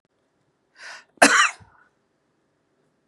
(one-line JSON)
{"cough_length": "3.1 s", "cough_amplitude": 32768, "cough_signal_mean_std_ratio": 0.24, "survey_phase": "beta (2021-08-13 to 2022-03-07)", "age": "45-64", "gender": "Female", "wearing_mask": "No", "symptom_none": true, "smoker_status": "Ex-smoker", "respiratory_condition_asthma": false, "respiratory_condition_other": false, "recruitment_source": "REACT", "submission_delay": "7 days", "covid_test_result": "Negative", "covid_test_method": "RT-qPCR", "influenza_a_test_result": "Negative", "influenza_b_test_result": "Negative"}